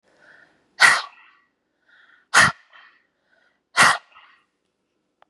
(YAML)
exhalation_length: 5.3 s
exhalation_amplitude: 31010
exhalation_signal_mean_std_ratio: 0.26
survey_phase: beta (2021-08-13 to 2022-03-07)
age: 45-64
gender: Female
wearing_mask: 'No'
symptom_cough_any: true
symptom_new_continuous_cough: true
symptom_shortness_of_breath: true
symptom_diarrhoea: true
symptom_fatigue: true
symptom_change_to_sense_of_smell_or_taste: true
symptom_loss_of_taste: true
symptom_other: true
symptom_onset: 5 days
smoker_status: Ex-smoker
respiratory_condition_asthma: true
respiratory_condition_other: false
recruitment_source: Test and Trace
submission_delay: 1 day
covid_test_result: Positive
covid_test_method: RT-qPCR
covid_ct_value: 23.3
covid_ct_gene: N gene
covid_ct_mean: 23.7
covid_viral_load: 17000 copies/ml
covid_viral_load_category: Low viral load (10K-1M copies/ml)